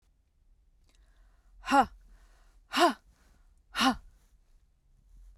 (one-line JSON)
{"exhalation_length": "5.4 s", "exhalation_amplitude": 10154, "exhalation_signal_mean_std_ratio": 0.28, "survey_phase": "beta (2021-08-13 to 2022-03-07)", "age": "45-64", "gender": "Female", "wearing_mask": "No", "symptom_cough_any": true, "symptom_runny_or_blocked_nose": true, "symptom_sore_throat": true, "symptom_fatigue": true, "symptom_fever_high_temperature": true, "symptom_onset": "3 days", "smoker_status": "Never smoked", "respiratory_condition_asthma": true, "respiratory_condition_other": false, "recruitment_source": "Test and Trace", "submission_delay": "2 days", "covid_test_result": "Positive", "covid_test_method": "RT-qPCR", "covid_ct_value": 21.5, "covid_ct_gene": "ORF1ab gene"}